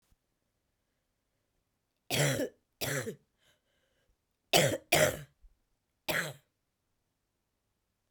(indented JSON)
{
  "three_cough_length": "8.1 s",
  "three_cough_amplitude": 12677,
  "three_cough_signal_mean_std_ratio": 0.3,
  "survey_phase": "beta (2021-08-13 to 2022-03-07)",
  "age": "45-64",
  "gender": "Female",
  "wearing_mask": "No",
  "symptom_cough_any": true,
  "symptom_runny_or_blocked_nose": true,
  "symptom_sore_throat": true,
  "symptom_fatigue": true,
  "symptom_fever_high_temperature": true,
  "symptom_headache": true,
  "smoker_status": "Never smoked",
  "respiratory_condition_asthma": false,
  "respiratory_condition_other": false,
  "recruitment_source": "Test and Trace",
  "submission_delay": "2 days",
  "covid_test_result": "Positive",
  "covid_test_method": "RT-qPCR",
  "covid_ct_value": 33.2,
  "covid_ct_gene": "ORF1ab gene"
}